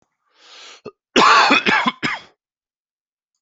{
  "cough_length": "3.4 s",
  "cough_amplitude": 29296,
  "cough_signal_mean_std_ratio": 0.41,
  "survey_phase": "alpha (2021-03-01 to 2021-08-12)",
  "age": "45-64",
  "gender": "Male",
  "wearing_mask": "No",
  "symptom_none": true,
  "symptom_onset": "13 days",
  "smoker_status": "Never smoked",
  "respiratory_condition_asthma": false,
  "respiratory_condition_other": false,
  "recruitment_source": "REACT",
  "submission_delay": "3 days",
  "covid_test_result": "Negative",
  "covid_test_method": "RT-qPCR"
}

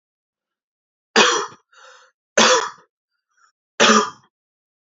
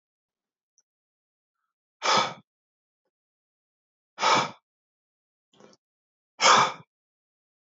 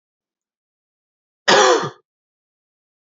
{
  "three_cough_length": "4.9 s",
  "three_cough_amplitude": 31481,
  "three_cough_signal_mean_std_ratio": 0.33,
  "exhalation_length": "7.7 s",
  "exhalation_amplitude": 19085,
  "exhalation_signal_mean_std_ratio": 0.25,
  "cough_length": "3.1 s",
  "cough_amplitude": 28454,
  "cough_signal_mean_std_ratio": 0.28,
  "survey_phase": "beta (2021-08-13 to 2022-03-07)",
  "age": "18-44",
  "gender": "Male",
  "wearing_mask": "No",
  "symptom_cough_any": true,
  "smoker_status": "Never smoked",
  "respiratory_condition_asthma": false,
  "respiratory_condition_other": false,
  "recruitment_source": "REACT",
  "submission_delay": "1 day",
  "covid_test_result": "Negative",
  "covid_test_method": "RT-qPCR",
  "influenza_a_test_result": "Unknown/Void",
  "influenza_b_test_result": "Unknown/Void"
}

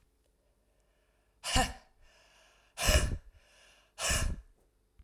{
  "exhalation_length": "5.0 s",
  "exhalation_amplitude": 8221,
  "exhalation_signal_mean_std_ratio": 0.36,
  "survey_phase": "alpha (2021-03-01 to 2021-08-12)",
  "age": "45-64",
  "gender": "Female",
  "wearing_mask": "No",
  "symptom_diarrhoea": true,
  "symptom_fatigue": true,
  "symptom_headache": true,
  "smoker_status": "Never smoked",
  "respiratory_condition_asthma": false,
  "respiratory_condition_other": false,
  "recruitment_source": "Test and Trace",
  "submission_delay": "2 days",
  "covid_test_result": "Positive",
  "covid_test_method": "RT-qPCR"
}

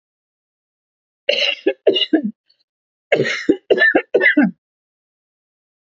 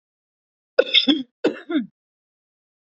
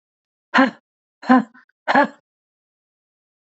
{
  "three_cough_length": "6.0 s",
  "three_cough_amplitude": 28174,
  "three_cough_signal_mean_std_ratio": 0.41,
  "cough_length": "2.9 s",
  "cough_amplitude": 27001,
  "cough_signal_mean_std_ratio": 0.32,
  "exhalation_length": "3.5 s",
  "exhalation_amplitude": 27086,
  "exhalation_signal_mean_std_ratio": 0.29,
  "survey_phase": "beta (2021-08-13 to 2022-03-07)",
  "age": "45-64",
  "gender": "Female",
  "wearing_mask": "No",
  "symptom_cough_any": true,
  "symptom_runny_or_blocked_nose": true,
  "symptom_sore_throat": true,
  "symptom_fatigue": true,
  "symptom_headache": true,
  "symptom_change_to_sense_of_smell_or_taste": true,
  "symptom_other": true,
  "smoker_status": "Never smoked",
  "respiratory_condition_asthma": true,
  "respiratory_condition_other": false,
  "recruitment_source": "Test and Trace",
  "submission_delay": "2 days",
  "covid_test_result": "Positive",
  "covid_test_method": "RT-qPCR",
  "covid_ct_value": 28.7,
  "covid_ct_gene": "ORF1ab gene",
  "covid_ct_mean": 29.2,
  "covid_viral_load": "270 copies/ml",
  "covid_viral_load_category": "Minimal viral load (< 10K copies/ml)"
}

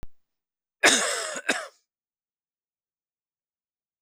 {
  "cough_length": "4.0 s",
  "cough_amplitude": 28399,
  "cough_signal_mean_std_ratio": 0.29,
  "survey_phase": "beta (2021-08-13 to 2022-03-07)",
  "age": "18-44",
  "gender": "Male",
  "wearing_mask": "No",
  "symptom_none": true,
  "smoker_status": "Current smoker (e-cigarettes or vapes only)",
  "respiratory_condition_asthma": false,
  "respiratory_condition_other": false,
  "recruitment_source": "REACT",
  "submission_delay": "2 days",
  "covid_test_result": "Negative",
  "covid_test_method": "RT-qPCR"
}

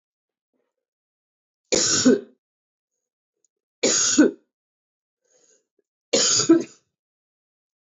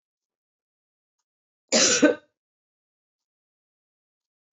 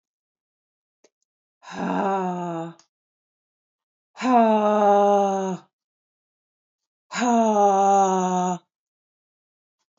{
  "three_cough_length": "7.9 s",
  "three_cough_amplitude": 18692,
  "three_cough_signal_mean_std_ratio": 0.33,
  "cough_length": "4.5 s",
  "cough_amplitude": 17261,
  "cough_signal_mean_std_ratio": 0.23,
  "exhalation_length": "10.0 s",
  "exhalation_amplitude": 18776,
  "exhalation_signal_mean_std_ratio": 0.48,
  "survey_phase": "beta (2021-08-13 to 2022-03-07)",
  "age": "45-64",
  "gender": "Female",
  "wearing_mask": "No",
  "symptom_none": true,
  "smoker_status": "Never smoked",
  "respiratory_condition_asthma": false,
  "respiratory_condition_other": false,
  "recruitment_source": "REACT",
  "submission_delay": "1 day",
  "covid_test_result": "Negative",
  "covid_test_method": "RT-qPCR"
}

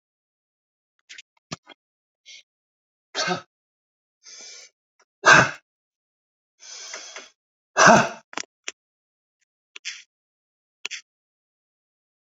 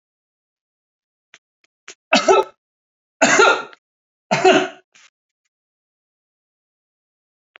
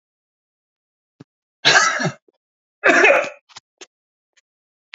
{
  "exhalation_length": "12.3 s",
  "exhalation_amplitude": 28632,
  "exhalation_signal_mean_std_ratio": 0.2,
  "three_cough_length": "7.6 s",
  "three_cough_amplitude": 29166,
  "three_cough_signal_mean_std_ratio": 0.29,
  "cough_length": "4.9 s",
  "cough_amplitude": 32767,
  "cough_signal_mean_std_ratio": 0.33,
  "survey_phase": "beta (2021-08-13 to 2022-03-07)",
  "age": "65+",
  "gender": "Male",
  "wearing_mask": "No",
  "symptom_cough_any": true,
  "smoker_status": "Never smoked",
  "respiratory_condition_asthma": false,
  "respiratory_condition_other": false,
  "recruitment_source": "REACT",
  "submission_delay": "3 days",
  "covid_test_result": "Negative",
  "covid_test_method": "RT-qPCR",
  "influenza_a_test_result": "Negative",
  "influenza_b_test_result": "Negative"
}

